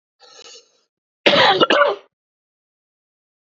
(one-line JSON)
{"cough_length": "3.4 s", "cough_amplitude": 32557, "cough_signal_mean_std_ratio": 0.36, "survey_phase": "beta (2021-08-13 to 2022-03-07)", "age": "45-64", "gender": "Male", "wearing_mask": "No", "symptom_cough_any": true, "symptom_headache": true, "smoker_status": "Ex-smoker", "respiratory_condition_asthma": false, "respiratory_condition_other": false, "recruitment_source": "REACT", "submission_delay": "3 days", "covid_test_result": "Negative", "covid_test_method": "RT-qPCR", "influenza_a_test_result": "Negative", "influenza_b_test_result": "Negative"}